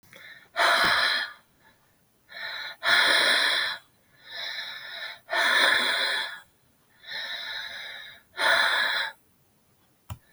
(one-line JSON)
{"exhalation_length": "10.3 s", "exhalation_amplitude": 15485, "exhalation_signal_mean_std_ratio": 0.58, "survey_phase": "beta (2021-08-13 to 2022-03-07)", "age": "45-64", "gender": "Female", "wearing_mask": "No", "symptom_cough_any": true, "symptom_shortness_of_breath": true, "symptom_abdominal_pain": true, "symptom_headache": true, "symptom_change_to_sense_of_smell_or_taste": true, "smoker_status": "Ex-smoker", "respiratory_condition_asthma": true, "respiratory_condition_other": true, "recruitment_source": "Test and Trace", "submission_delay": "1 day", "covid_test_result": "Positive", "covid_test_method": "RT-qPCR", "covid_ct_value": 21.1, "covid_ct_gene": "ORF1ab gene", "covid_ct_mean": 21.5, "covid_viral_load": "90000 copies/ml", "covid_viral_load_category": "Low viral load (10K-1M copies/ml)"}